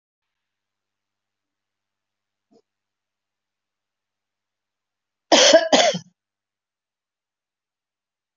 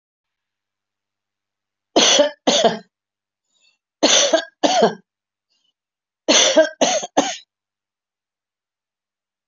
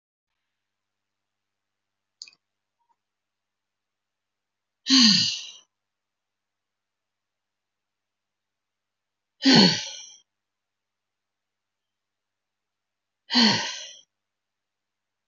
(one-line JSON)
{"cough_length": "8.4 s", "cough_amplitude": 26944, "cough_signal_mean_std_ratio": 0.2, "three_cough_length": "9.5 s", "three_cough_amplitude": 31064, "three_cough_signal_mean_std_ratio": 0.37, "exhalation_length": "15.3 s", "exhalation_amplitude": 24067, "exhalation_signal_mean_std_ratio": 0.22, "survey_phase": "alpha (2021-03-01 to 2021-08-12)", "age": "65+", "gender": "Female", "wearing_mask": "No", "symptom_none": true, "smoker_status": "Never smoked", "respiratory_condition_asthma": false, "respiratory_condition_other": false, "recruitment_source": "REACT", "submission_delay": "16 days", "covid_test_result": "Negative", "covid_test_method": "RT-qPCR"}